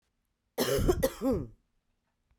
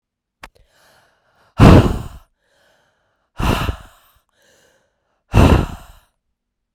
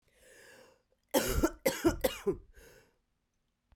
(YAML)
cough_length: 2.4 s
cough_amplitude: 6727
cough_signal_mean_std_ratio: 0.47
exhalation_length: 6.7 s
exhalation_amplitude: 32768
exhalation_signal_mean_std_ratio: 0.29
three_cough_length: 3.8 s
three_cough_amplitude: 7148
three_cough_signal_mean_std_ratio: 0.38
survey_phase: beta (2021-08-13 to 2022-03-07)
age: 18-44
gender: Female
wearing_mask: 'No'
symptom_cough_any: true
symptom_runny_or_blocked_nose: true
symptom_shortness_of_breath: true
symptom_fatigue: true
symptom_headache: true
symptom_change_to_sense_of_smell_or_taste: true
symptom_loss_of_taste: true
symptom_onset: 2 days
smoker_status: Never smoked
respiratory_condition_asthma: false
respiratory_condition_other: false
recruitment_source: Test and Trace
submission_delay: 2 days
covid_test_result: Positive
covid_test_method: RT-qPCR